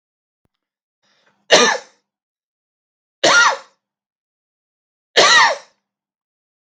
{"three_cough_length": "6.7 s", "three_cough_amplitude": 32768, "three_cough_signal_mean_std_ratio": 0.31, "survey_phase": "beta (2021-08-13 to 2022-03-07)", "age": "45-64", "gender": "Male", "wearing_mask": "No", "symptom_none": true, "smoker_status": "Never smoked", "recruitment_source": "REACT", "submission_delay": "2 days", "covid_test_result": "Negative", "covid_test_method": "RT-qPCR", "influenza_a_test_result": "Negative", "influenza_b_test_result": "Negative"}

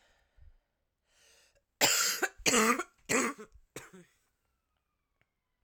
{"cough_length": "5.6 s", "cough_amplitude": 10976, "cough_signal_mean_std_ratio": 0.35, "survey_phase": "alpha (2021-03-01 to 2021-08-12)", "age": "18-44", "gender": "Female", "wearing_mask": "No", "symptom_cough_any": true, "symptom_change_to_sense_of_smell_or_taste": true, "symptom_loss_of_taste": true, "symptom_onset": "6 days", "smoker_status": "Current smoker (1 to 10 cigarettes per day)", "respiratory_condition_asthma": false, "respiratory_condition_other": false, "recruitment_source": "Test and Trace", "submission_delay": "2 days", "covid_test_result": "Positive", "covid_test_method": "RT-qPCR", "covid_ct_value": 18.3, "covid_ct_gene": "ORF1ab gene", "covid_ct_mean": 18.6, "covid_viral_load": "820000 copies/ml", "covid_viral_load_category": "Low viral load (10K-1M copies/ml)"}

